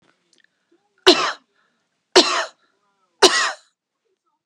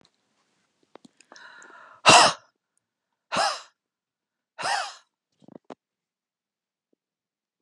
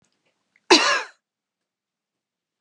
{"three_cough_length": "4.5 s", "three_cough_amplitude": 32768, "three_cough_signal_mean_std_ratio": 0.29, "exhalation_length": "7.6 s", "exhalation_amplitude": 29324, "exhalation_signal_mean_std_ratio": 0.22, "cough_length": "2.6 s", "cough_amplitude": 29238, "cough_signal_mean_std_ratio": 0.25, "survey_phase": "beta (2021-08-13 to 2022-03-07)", "age": "45-64", "gender": "Female", "wearing_mask": "No", "symptom_none": true, "symptom_onset": "12 days", "smoker_status": "Never smoked", "respiratory_condition_asthma": false, "respiratory_condition_other": false, "recruitment_source": "REACT", "submission_delay": "3 days", "covid_test_result": "Negative", "covid_test_method": "RT-qPCR"}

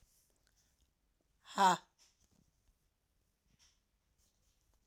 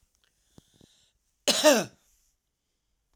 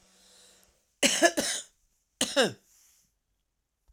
{"exhalation_length": "4.9 s", "exhalation_amplitude": 4585, "exhalation_signal_mean_std_ratio": 0.18, "cough_length": "3.2 s", "cough_amplitude": 16065, "cough_signal_mean_std_ratio": 0.26, "three_cough_length": "3.9 s", "three_cough_amplitude": 17752, "three_cough_signal_mean_std_ratio": 0.32, "survey_phase": "alpha (2021-03-01 to 2021-08-12)", "age": "45-64", "gender": "Female", "wearing_mask": "No", "symptom_cough_any": true, "symptom_headache": true, "symptom_change_to_sense_of_smell_or_taste": true, "symptom_loss_of_taste": true, "symptom_onset": "7 days", "smoker_status": "Never smoked", "respiratory_condition_asthma": false, "respiratory_condition_other": false, "recruitment_source": "Test and Trace", "submission_delay": "3 days", "covid_test_result": "Positive", "covid_test_method": "RT-qPCR", "covid_ct_value": 29.7, "covid_ct_gene": "ORF1ab gene"}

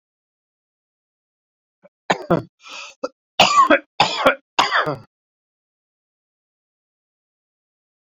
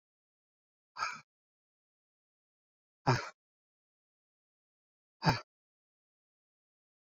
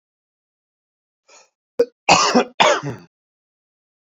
{"three_cough_length": "8.0 s", "three_cough_amplitude": 31736, "three_cough_signal_mean_std_ratio": 0.29, "exhalation_length": "7.1 s", "exhalation_amplitude": 5692, "exhalation_signal_mean_std_ratio": 0.18, "cough_length": "4.1 s", "cough_amplitude": 29221, "cough_signal_mean_std_ratio": 0.31, "survey_phase": "beta (2021-08-13 to 2022-03-07)", "age": "45-64", "gender": "Male", "wearing_mask": "No", "symptom_cough_any": true, "symptom_shortness_of_breath": true, "symptom_abdominal_pain": true, "symptom_fatigue": true, "symptom_headache": true, "symptom_onset": "12 days", "smoker_status": "Never smoked", "respiratory_condition_asthma": true, "respiratory_condition_other": false, "recruitment_source": "REACT", "submission_delay": "1 day", "covid_test_method": "RT-qPCR"}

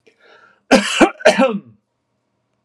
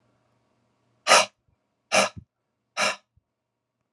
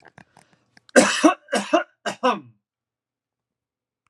{"cough_length": "2.6 s", "cough_amplitude": 32768, "cough_signal_mean_std_ratio": 0.38, "exhalation_length": "3.9 s", "exhalation_amplitude": 26766, "exhalation_signal_mean_std_ratio": 0.26, "three_cough_length": "4.1 s", "three_cough_amplitude": 31903, "three_cough_signal_mean_std_ratio": 0.32, "survey_phase": "alpha (2021-03-01 to 2021-08-12)", "age": "45-64", "gender": "Male", "wearing_mask": "No", "symptom_none": true, "smoker_status": "Never smoked", "respiratory_condition_asthma": false, "respiratory_condition_other": false, "recruitment_source": "Test and Trace", "submission_delay": "0 days", "covid_test_result": "Negative", "covid_test_method": "LFT"}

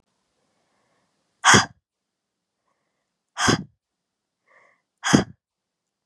{"exhalation_length": "6.1 s", "exhalation_amplitude": 31812, "exhalation_signal_mean_std_ratio": 0.23, "survey_phase": "beta (2021-08-13 to 2022-03-07)", "age": "18-44", "gender": "Female", "wearing_mask": "No", "symptom_diarrhoea": true, "smoker_status": "Never smoked", "respiratory_condition_asthma": false, "respiratory_condition_other": false, "recruitment_source": "Test and Trace", "submission_delay": "3 days", "covid_test_result": "Negative", "covid_test_method": "RT-qPCR"}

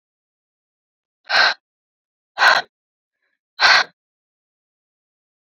{"exhalation_length": "5.5 s", "exhalation_amplitude": 29193, "exhalation_signal_mean_std_ratio": 0.28, "survey_phase": "beta (2021-08-13 to 2022-03-07)", "age": "18-44", "gender": "Female", "wearing_mask": "No", "symptom_cough_any": true, "symptom_runny_or_blocked_nose": true, "symptom_sore_throat": true, "symptom_headache": true, "smoker_status": "Current smoker (1 to 10 cigarettes per day)", "respiratory_condition_asthma": false, "respiratory_condition_other": false, "recruitment_source": "Test and Trace", "submission_delay": "2 days", "covid_test_result": "Positive", "covid_test_method": "RT-qPCR", "covid_ct_value": 20.9, "covid_ct_gene": "ORF1ab gene", "covid_ct_mean": 21.4, "covid_viral_load": "92000 copies/ml", "covid_viral_load_category": "Low viral load (10K-1M copies/ml)"}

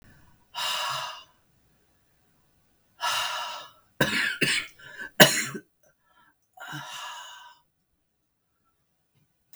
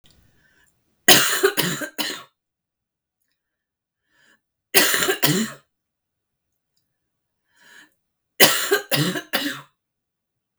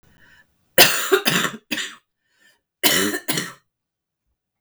{"exhalation_length": "9.6 s", "exhalation_amplitude": 32768, "exhalation_signal_mean_std_ratio": 0.33, "three_cough_length": "10.6 s", "three_cough_amplitude": 32768, "three_cough_signal_mean_std_ratio": 0.34, "cough_length": "4.6 s", "cough_amplitude": 32768, "cough_signal_mean_std_ratio": 0.38, "survey_phase": "beta (2021-08-13 to 2022-03-07)", "age": "18-44", "gender": "Female", "wearing_mask": "No", "symptom_cough_any": true, "symptom_runny_or_blocked_nose": true, "symptom_fatigue": true, "symptom_headache": true, "symptom_other": true, "smoker_status": "Never smoked", "respiratory_condition_asthma": false, "respiratory_condition_other": false, "recruitment_source": "REACT", "submission_delay": "10 days", "covid_test_result": "Negative", "covid_test_method": "RT-qPCR", "influenza_a_test_result": "Unknown/Void", "influenza_b_test_result": "Unknown/Void"}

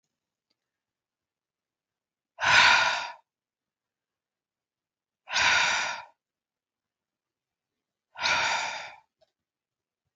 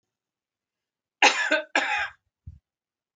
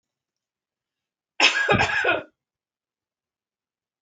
{"exhalation_length": "10.2 s", "exhalation_amplitude": 17329, "exhalation_signal_mean_std_ratio": 0.33, "cough_length": "3.2 s", "cough_amplitude": 20814, "cough_signal_mean_std_ratio": 0.34, "three_cough_length": "4.0 s", "three_cough_amplitude": 23726, "three_cough_signal_mean_std_ratio": 0.34, "survey_phase": "beta (2021-08-13 to 2022-03-07)", "age": "45-64", "gender": "Female", "wearing_mask": "No", "symptom_none": true, "symptom_onset": "5 days", "smoker_status": "Ex-smoker", "respiratory_condition_asthma": false, "respiratory_condition_other": false, "recruitment_source": "REACT", "submission_delay": "1 day", "covid_test_result": "Negative", "covid_test_method": "RT-qPCR", "influenza_a_test_result": "Negative", "influenza_b_test_result": "Negative"}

